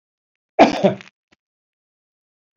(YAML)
cough_length: 2.6 s
cough_amplitude: 31853
cough_signal_mean_std_ratio: 0.24
survey_phase: beta (2021-08-13 to 2022-03-07)
age: 65+
gender: Male
wearing_mask: 'No'
symptom_sore_throat: true
symptom_headache: true
symptom_onset: 12 days
smoker_status: Never smoked
respiratory_condition_asthma: false
respiratory_condition_other: false
recruitment_source: REACT
submission_delay: 4 days
covid_test_result: Negative
covid_test_method: RT-qPCR
influenza_a_test_result: Negative
influenza_b_test_result: Negative